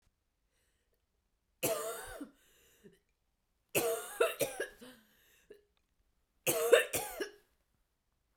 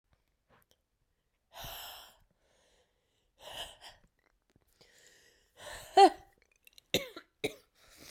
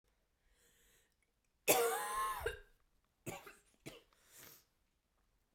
{"three_cough_length": "8.4 s", "three_cough_amplitude": 10189, "three_cough_signal_mean_std_ratio": 0.33, "exhalation_length": "8.1 s", "exhalation_amplitude": 10664, "exhalation_signal_mean_std_ratio": 0.17, "cough_length": "5.5 s", "cough_amplitude": 6743, "cough_signal_mean_std_ratio": 0.33, "survey_phase": "beta (2021-08-13 to 2022-03-07)", "age": "18-44", "gender": "Female", "wearing_mask": "No", "symptom_cough_any": true, "symptom_runny_or_blocked_nose": true, "symptom_fatigue": true, "symptom_fever_high_temperature": true, "symptom_headache": true, "symptom_other": true, "symptom_onset": "3 days", "smoker_status": "Never smoked", "respiratory_condition_asthma": false, "respiratory_condition_other": false, "recruitment_source": "Test and Trace", "submission_delay": "1 day", "covid_test_result": "Positive", "covid_test_method": "RT-qPCR", "covid_ct_value": 16.4, "covid_ct_gene": "ORF1ab gene"}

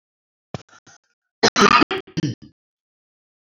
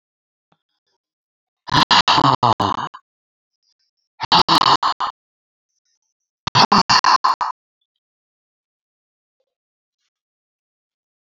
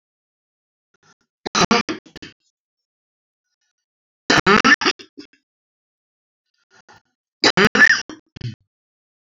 {"cough_length": "3.4 s", "cough_amplitude": 28485, "cough_signal_mean_std_ratio": 0.29, "exhalation_length": "11.3 s", "exhalation_amplitude": 30528, "exhalation_signal_mean_std_ratio": 0.32, "three_cough_length": "9.4 s", "three_cough_amplitude": 29256, "three_cough_signal_mean_std_ratio": 0.27, "survey_phase": "beta (2021-08-13 to 2022-03-07)", "age": "45-64", "gender": "Female", "wearing_mask": "No", "symptom_none": true, "smoker_status": "Current smoker (11 or more cigarettes per day)", "respiratory_condition_asthma": true, "respiratory_condition_other": true, "recruitment_source": "REACT", "submission_delay": "1 day", "covid_test_result": "Negative", "covid_test_method": "RT-qPCR", "influenza_a_test_result": "Negative", "influenza_b_test_result": "Negative"}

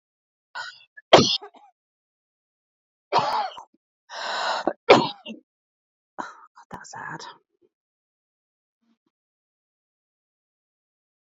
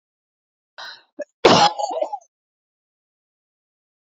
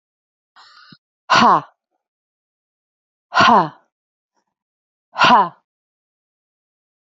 {"three_cough_length": "11.3 s", "three_cough_amplitude": 31024, "three_cough_signal_mean_std_ratio": 0.24, "cough_length": "4.0 s", "cough_amplitude": 28114, "cough_signal_mean_std_ratio": 0.27, "exhalation_length": "7.1 s", "exhalation_amplitude": 28765, "exhalation_signal_mean_std_ratio": 0.29, "survey_phase": "alpha (2021-03-01 to 2021-08-12)", "age": "45-64", "gender": "Female", "wearing_mask": "No", "symptom_none": true, "smoker_status": "Never smoked", "respiratory_condition_asthma": false, "respiratory_condition_other": false, "recruitment_source": "Test and Trace", "submission_delay": "0 days", "covid_test_result": "Negative", "covid_test_method": "RT-qPCR"}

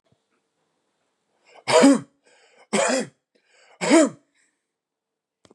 {"three_cough_length": "5.5 s", "three_cough_amplitude": 23840, "three_cough_signal_mean_std_ratio": 0.31, "survey_phase": "beta (2021-08-13 to 2022-03-07)", "age": "45-64", "gender": "Male", "wearing_mask": "No", "symptom_none": true, "smoker_status": "Never smoked", "respiratory_condition_asthma": false, "respiratory_condition_other": false, "recruitment_source": "REACT", "submission_delay": "1 day", "covid_test_result": "Negative", "covid_test_method": "RT-qPCR", "influenza_a_test_result": "Negative", "influenza_b_test_result": "Negative"}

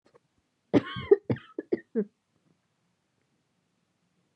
{"cough_length": "4.4 s", "cough_amplitude": 14878, "cough_signal_mean_std_ratio": 0.22, "survey_phase": "beta (2021-08-13 to 2022-03-07)", "age": "18-44", "gender": "Female", "wearing_mask": "No", "symptom_cough_any": true, "symptom_new_continuous_cough": true, "symptom_runny_or_blocked_nose": true, "symptom_sore_throat": true, "symptom_fatigue": true, "symptom_fever_high_temperature": true, "symptom_headache": true, "symptom_onset": "4 days", "smoker_status": "Never smoked", "respiratory_condition_asthma": false, "respiratory_condition_other": false, "recruitment_source": "Test and Trace", "submission_delay": "1 day", "covid_test_result": "Positive", "covid_test_method": "ePCR"}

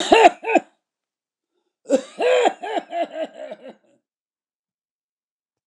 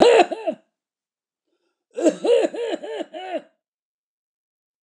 {"three_cough_length": "5.7 s", "three_cough_amplitude": 29204, "three_cough_signal_mean_std_ratio": 0.35, "cough_length": "4.8 s", "cough_amplitude": 29203, "cough_signal_mean_std_ratio": 0.38, "survey_phase": "beta (2021-08-13 to 2022-03-07)", "age": "65+", "gender": "Male", "wearing_mask": "No", "symptom_cough_any": true, "symptom_runny_or_blocked_nose": true, "smoker_status": "Ex-smoker", "respiratory_condition_asthma": false, "respiratory_condition_other": false, "recruitment_source": "REACT", "submission_delay": "2 days", "covid_test_result": "Negative", "covid_test_method": "RT-qPCR", "influenza_a_test_result": "Negative", "influenza_b_test_result": "Negative"}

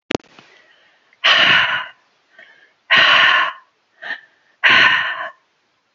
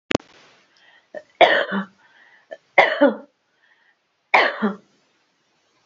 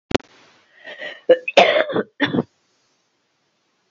{"exhalation_length": "5.9 s", "exhalation_amplitude": 32768, "exhalation_signal_mean_std_ratio": 0.47, "three_cough_length": "5.9 s", "three_cough_amplitude": 32589, "three_cough_signal_mean_std_ratio": 0.32, "cough_length": "3.9 s", "cough_amplitude": 32008, "cough_signal_mean_std_ratio": 0.33, "survey_phase": "beta (2021-08-13 to 2022-03-07)", "age": "45-64", "gender": "Female", "wearing_mask": "No", "symptom_cough_any": true, "symptom_shortness_of_breath": true, "symptom_change_to_sense_of_smell_or_taste": true, "symptom_other": true, "smoker_status": "Ex-smoker", "respiratory_condition_asthma": false, "respiratory_condition_other": false, "recruitment_source": "Test and Trace", "submission_delay": "2 days", "covid_test_result": "Positive", "covid_test_method": "LFT"}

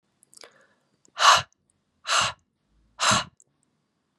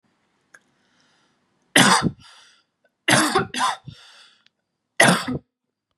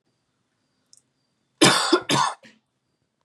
{"exhalation_length": "4.2 s", "exhalation_amplitude": 23835, "exhalation_signal_mean_std_ratio": 0.31, "three_cough_length": "6.0 s", "three_cough_amplitude": 32718, "three_cough_signal_mean_std_ratio": 0.35, "cough_length": "3.2 s", "cough_amplitude": 26755, "cough_signal_mean_std_ratio": 0.33, "survey_phase": "beta (2021-08-13 to 2022-03-07)", "age": "18-44", "gender": "Female", "wearing_mask": "No", "symptom_sore_throat": true, "symptom_onset": "6 days", "smoker_status": "Never smoked", "respiratory_condition_asthma": false, "respiratory_condition_other": false, "recruitment_source": "Test and Trace", "submission_delay": "2 days", "covid_test_result": "Positive", "covid_test_method": "ePCR"}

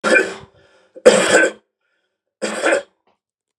{"three_cough_length": "3.6 s", "three_cough_amplitude": 32768, "three_cough_signal_mean_std_ratio": 0.41, "survey_phase": "beta (2021-08-13 to 2022-03-07)", "age": "45-64", "gender": "Male", "wearing_mask": "No", "symptom_cough_any": true, "smoker_status": "Never smoked", "respiratory_condition_asthma": false, "respiratory_condition_other": false, "recruitment_source": "Test and Trace", "submission_delay": "2 days", "covid_test_result": "Positive", "covid_test_method": "RT-qPCR", "covid_ct_value": 19.2, "covid_ct_gene": "ORF1ab gene"}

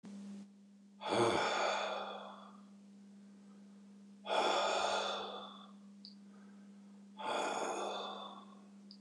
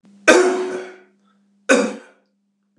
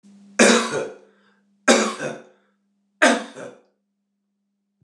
{"exhalation_length": "9.0 s", "exhalation_amplitude": 3242, "exhalation_signal_mean_std_ratio": 0.63, "cough_length": "2.8 s", "cough_amplitude": 29204, "cough_signal_mean_std_ratio": 0.4, "three_cough_length": "4.8 s", "three_cough_amplitude": 29182, "three_cough_signal_mean_std_ratio": 0.35, "survey_phase": "beta (2021-08-13 to 2022-03-07)", "age": "65+", "gender": "Male", "wearing_mask": "No", "symptom_none": true, "smoker_status": "Never smoked", "respiratory_condition_asthma": false, "respiratory_condition_other": false, "recruitment_source": "REACT", "submission_delay": "2 days", "covid_test_result": "Negative", "covid_test_method": "RT-qPCR"}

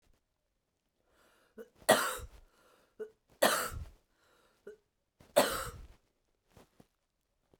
{"three_cough_length": "7.6 s", "three_cough_amplitude": 11753, "three_cough_signal_mean_std_ratio": 0.26, "survey_phase": "beta (2021-08-13 to 2022-03-07)", "age": "45-64", "gender": "Female", "wearing_mask": "No", "symptom_new_continuous_cough": true, "symptom_sore_throat": true, "symptom_onset": "3 days", "smoker_status": "Never smoked", "respiratory_condition_asthma": false, "respiratory_condition_other": false, "recruitment_source": "Test and Trace", "submission_delay": "1 day", "covid_test_result": "Positive", "covid_test_method": "RT-qPCR", "covid_ct_value": 34.2, "covid_ct_gene": "ORF1ab gene"}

